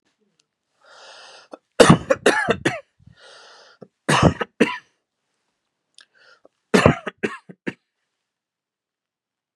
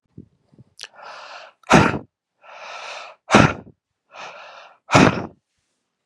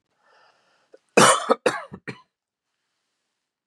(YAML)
three_cough_length: 9.6 s
three_cough_amplitude: 32768
three_cough_signal_mean_std_ratio: 0.27
exhalation_length: 6.1 s
exhalation_amplitude: 32768
exhalation_signal_mean_std_ratio: 0.3
cough_length: 3.7 s
cough_amplitude: 31288
cough_signal_mean_std_ratio: 0.26
survey_phase: beta (2021-08-13 to 2022-03-07)
age: 18-44
gender: Male
wearing_mask: 'No'
symptom_none: true
smoker_status: Never smoked
respiratory_condition_asthma: false
respiratory_condition_other: false
recruitment_source: REACT
submission_delay: 1 day
covid_test_result: Negative
covid_test_method: RT-qPCR
influenza_a_test_result: Unknown/Void
influenza_b_test_result: Unknown/Void